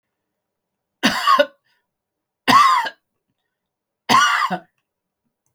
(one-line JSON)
{"three_cough_length": "5.5 s", "three_cough_amplitude": 32766, "three_cough_signal_mean_std_ratio": 0.38, "survey_phase": "beta (2021-08-13 to 2022-03-07)", "age": "65+", "gender": "Male", "wearing_mask": "No", "symptom_none": true, "smoker_status": "Ex-smoker", "respiratory_condition_asthma": false, "respiratory_condition_other": false, "recruitment_source": "REACT", "submission_delay": "1 day", "covid_test_result": "Negative", "covid_test_method": "RT-qPCR", "influenza_a_test_result": "Negative", "influenza_b_test_result": "Negative"}